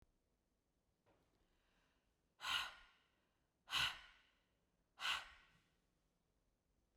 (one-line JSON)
{"exhalation_length": "7.0 s", "exhalation_amplitude": 1532, "exhalation_signal_mean_std_ratio": 0.28, "survey_phase": "beta (2021-08-13 to 2022-03-07)", "age": "45-64", "gender": "Female", "wearing_mask": "No", "symptom_none": true, "smoker_status": "Never smoked", "respiratory_condition_asthma": false, "respiratory_condition_other": false, "recruitment_source": "REACT", "submission_delay": "2 days", "covid_test_result": "Negative", "covid_test_method": "RT-qPCR"}